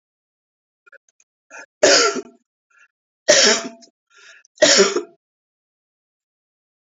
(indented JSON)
{
  "three_cough_length": "6.8 s",
  "three_cough_amplitude": 32767,
  "three_cough_signal_mean_std_ratio": 0.32,
  "survey_phase": "beta (2021-08-13 to 2022-03-07)",
  "age": "45-64",
  "gender": "Female",
  "wearing_mask": "No",
  "symptom_none": true,
  "symptom_onset": "12 days",
  "smoker_status": "Never smoked",
  "respiratory_condition_asthma": false,
  "respiratory_condition_other": false,
  "recruitment_source": "REACT",
  "submission_delay": "2 days",
  "covid_test_result": "Negative",
  "covid_test_method": "RT-qPCR"
}